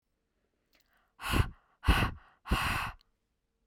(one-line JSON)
{"exhalation_length": "3.7 s", "exhalation_amplitude": 9434, "exhalation_signal_mean_std_ratio": 0.38, "survey_phase": "beta (2021-08-13 to 2022-03-07)", "age": "18-44", "gender": "Female", "wearing_mask": "No", "symptom_none": true, "smoker_status": "Never smoked", "respiratory_condition_asthma": false, "respiratory_condition_other": false, "recruitment_source": "REACT", "submission_delay": "1 day", "covid_test_result": "Negative", "covid_test_method": "RT-qPCR", "influenza_a_test_result": "Unknown/Void", "influenza_b_test_result": "Unknown/Void"}